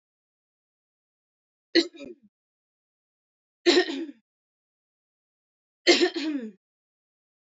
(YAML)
three_cough_length: 7.6 s
three_cough_amplitude: 17236
three_cough_signal_mean_std_ratio: 0.26
survey_phase: alpha (2021-03-01 to 2021-08-12)
age: 18-44
gender: Female
wearing_mask: 'No'
symptom_cough_any: true
symptom_fatigue: true
symptom_change_to_sense_of_smell_or_taste: true
symptom_loss_of_taste: true
symptom_onset: 8 days
smoker_status: Never smoked
respiratory_condition_asthma: false
respiratory_condition_other: false
recruitment_source: Test and Trace
submission_delay: 3 days
covid_test_result: Positive
covid_test_method: RT-qPCR
covid_ct_value: 21.5
covid_ct_gene: ORF1ab gene